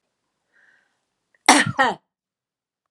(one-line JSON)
{"cough_length": "2.9 s", "cough_amplitude": 32768, "cough_signal_mean_std_ratio": 0.25, "survey_phase": "alpha (2021-03-01 to 2021-08-12)", "age": "45-64", "gender": "Female", "wearing_mask": "No", "symptom_none": true, "smoker_status": "Never smoked", "respiratory_condition_asthma": false, "respiratory_condition_other": false, "recruitment_source": "REACT", "submission_delay": "1 day", "covid_test_result": "Negative", "covid_test_method": "RT-qPCR"}